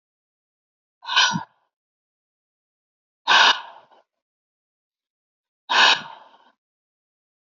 {"exhalation_length": "7.6 s", "exhalation_amplitude": 26461, "exhalation_signal_mean_std_ratio": 0.27, "survey_phase": "alpha (2021-03-01 to 2021-08-12)", "age": "65+", "gender": "Male", "wearing_mask": "No", "symptom_none": true, "smoker_status": "Ex-smoker", "respiratory_condition_asthma": false, "respiratory_condition_other": false, "recruitment_source": "REACT", "submission_delay": "2 days", "covid_test_result": "Negative", "covid_test_method": "RT-qPCR"}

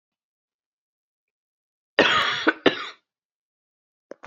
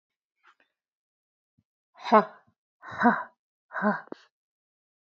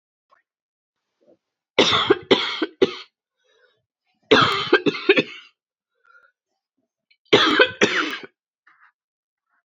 {"cough_length": "4.3 s", "cough_amplitude": 28033, "cough_signal_mean_std_ratio": 0.28, "exhalation_length": "5.0 s", "exhalation_amplitude": 20304, "exhalation_signal_mean_std_ratio": 0.24, "three_cough_length": "9.6 s", "three_cough_amplitude": 30470, "three_cough_signal_mean_std_ratio": 0.35, "survey_phase": "beta (2021-08-13 to 2022-03-07)", "age": "18-44", "gender": "Female", "wearing_mask": "No", "symptom_cough_any": true, "symptom_runny_or_blocked_nose": true, "symptom_sore_throat": true, "symptom_fatigue": true, "symptom_other": true, "symptom_onset": "3 days", "smoker_status": "Ex-smoker", "respiratory_condition_asthma": false, "respiratory_condition_other": false, "recruitment_source": "Test and Trace", "submission_delay": "1 day", "covid_test_result": "Positive", "covid_test_method": "RT-qPCR", "covid_ct_value": 17.3, "covid_ct_gene": "ORF1ab gene", "covid_ct_mean": 17.4, "covid_viral_load": "1900000 copies/ml", "covid_viral_load_category": "High viral load (>1M copies/ml)"}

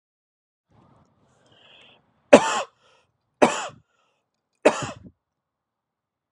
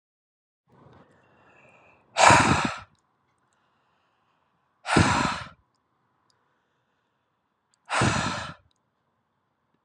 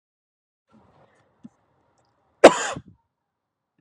{"three_cough_length": "6.3 s", "three_cough_amplitude": 32768, "three_cough_signal_mean_std_ratio": 0.19, "exhalation_length": "9.8 s", "exhalation_amplitude": 29204, "exhalation_signal_mean_std_ratio": 0.29, "cough_length": "3.8 s", "cough_amplitude": 32768, "cough_signal_mean_std_ratio": 0.14, "survey_phase": "beta (2021-08-13 to 2022-03-07)", "age": "18-44", "gender": "Male", "wearing_mask": "No", "symptom_none": true, "smoker_status": "Ex-smoker", "respiratory_condition_asthma": false, "respiratory_condition_other": false, "recruitment_source": "REACT", "submission_delay": "1 day", "covid_test_result": "Negative", "covid_test_method": "RT-qPCR"}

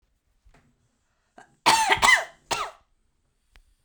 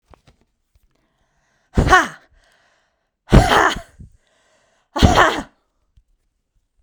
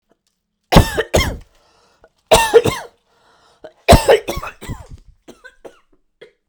{"cough_length": "3.8 s", "cough_amplitude": 23972, "cough_signal_mean_std_ratio": 0.32, "exhalation_length": "6.8 s", "exhalation_amplitude": 32768, "exhalation_signal_mean_std_ratio": 0.3, "three_cough_length": "6.5 s", "three_cough_amplitude": 32768, "three_cough_signal_mean_std_ratio": 0.33, "survey_phase": "beta (2021-08-13 to 2022-03-07)", "age": "18-44", "gender": "Female", "wearing_mask": "No", "symptom_shortness_of_breath": true, "symptom_fatigue": true, "symptom_headache": true, "symptom_change_to_sense_of_smell_or_taste": true, "symptom_onset": "3 days", "smoker_status": "Ex-smoker", "respiratory_condition_asthma": false, "respiratory_condition_other": false, "recruitment_source": "REACT", "submission_delay": "1 day", "covid_test_result": "Negative", "covid_test_method": "RT-qPCR"}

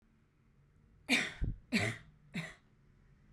{"three_cough_length": "3.3 s", "three_cough_amplitude": 4176, "three_cough_signal_mean_std_ratio": 0.4, "survey_phase": "beta (2021-08-13 to 2022-03-07)", "age": "18-44", "gender": "Female", "wearing_mask": "No", "symptom_cough_any": true, "symptom_runny_or_blocked_nose": true, "symptom_sore_throat": true, "symptom_fatigue": true, "symptom_fever_high_temperature": true, "symptom_headache": true, "symptom_other": true, "symptom_onset": "3 days", "smoker_status": "Never smoked", "respiratory_condition_asthma": true, "respiratory_condition_other": false, "recruitment_source": "Test and Trace", "submission_delay": "1 day", "covid_test_result": "Positive", "covid_test_method": "RT-qPCR", "covid_ct_value": 17.8, "covid_ct_gene": "N gene", "covid_ct_mean": 18.6, "covid_viral_load": "810000 copies/ml", "covid_viral_load_category": "Low viral load (10K-1M copies/ml)"}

